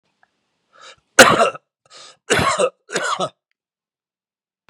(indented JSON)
{
  "cough_length": "4.7 s",
  "cough_amplitude": 32768,
  "cough_signal_mean_std_ratio": 0.32,
  "survey_phase": "beta (2021-08-13 to 2022-03-07)",
  "age": "65+",
  "gender": "Male",
  "wearing_mask": "No",
  "symptom_cough_any": true,
  "symptom_runny_or_blocked_nose": true,
  "symptom_fever_high_temperature": true,
  "symptom_other": true,
  "symptom_onset": "3 days",
  "smoker_status": "Ex-smoker",
  "respiratory_condition_asthma": false,
  "respiratory_condition_other": false,
  "recruitment_source": "Test and Trace",
  "submission_delay": "2 days",
  "covid_test_result": "Positive",
  "covid_test_method": "RT-qPCR",
  "covid_ct_value": 23.7,
  "covid_ct_gene": "ORF1ab gene",
  "covid_ct_mean": 24.1,
  "covid_viral_load": "13000 copies/ml",
  "covid_viral_load_category": "Low viral load (10K-1M copies/ml)"
}